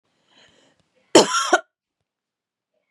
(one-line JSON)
{"cough_length": "2.9 s", "cough_amplitude": 32767, "cough_signal_mean_std_ratio": 0.24, "survey_phase": "beta (2021-08-13 to 2022-03-07)", "age": "45-64", "gender": "Female", "wearing_mask": "No", "symptom_cough_any": true, "symptom_runny_or_blocked_nose": true, "symptom_shortness_of_breath": true, "symptom_sore_throat": true, "symptom_abdominal_pain": true, "symptom_fatigue": true, "symptom_headache": true, "symptom_change_to_sense_of_smell_or_taste": true, "symptom_onset": "4 days", "smoker_status": "Never smoked", "respiratory_condition_asthma": true, "respiratory_condition_other": false, "recruitment_source": "Test and Trace", "submission_delay": "2 days", "covid_test_result": "Positive", "covid_test_method": "RT-qPCR", "covid_ct_value": 16.1, "covid_ct_gene": "N gene", "covid_ct_mean": 16.1, "covid_viral_load": "5300000 copies/ml", "covid_viral_load_category": "High viral load (>1M copies/ml)"}